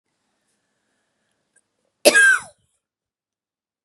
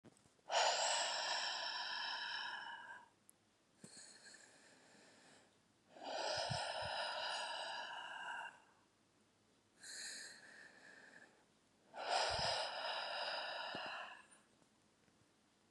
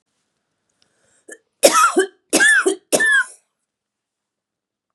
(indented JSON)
{
  "cough_length": "3.8 s",
  "cough_amplitude": 32767,
  "cough_signal_mean_std_ratio": 0.24,
  "exhalation_length": "15.7 s",
  "exhalation_amplitude": 2161,
  "exhalation_signal_mean_std_ratio": 0.62,
  "three_cough_length": "4.9 s",
  "three_cough_amplitude": 32768,
  "three_cough_signal_mean_std_ratio": 0.4,
  "survey_phase": "beta (2021-08-13 to 2022-03-07)",
  "age": "45-64",
  "gender": "Female",
  "wearing_mask": "No",
  "symptom_cough_any": true,
  "symptom_runny_or_blocked_nose": true,
  "symptom_shortness_of_breath": true,
  "symptom_sore_throat": true,
  "symptom_headache": true,
  "symptom_other": true,
  "smoker_status": "Never smoked",
  "respiratory_condition_asthma": false,
  "respiratory_condition_other": false,
  "recruitment_source": "Test and Trace",
  "submission_delay": "2 days",
  "covid_test_result": "Positive",
  "covid_test_method": "RT-qPCR",
  "covid_ct_value": 19.1,
  "covid_ct_gene": "ORF1ab gene"
}